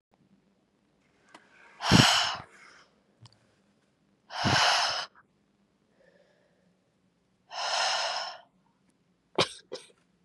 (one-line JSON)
{"exhalation_length": "10.2 s", "exhalation_amplitude": 18252, "exhalation_signal_mean_std_ratio": 0.34, "survey_phase": "beta (2021-08-13 to 2022-03-07)", "age": "18-44", "gender": "Female", "wearing_mask": "No", "symptom_cough_any": true, "symptom_new_continuous_cough": true, "symptom_runny_or_blocked_nose": true, "symptom_shortness_of_breath": true, "symptom_diarrhoea": true, "symptom_fatigue": true, "symptom_fever_high_temperature": true, "symptom_headache": true, "symptom_change_to_sense_of_smell_or_taste": true, "symptom_other": true, "symptom_onset": "3 days", "smoker_status": "Never smoked", "respiratory_condition_asthma": true, "respiratory_condition_other": false, "recruitment_source": "Test and Trace", "submission_delay": "1 day", "covid_test_result": "Positive", "covid_test_method": "ePCR"}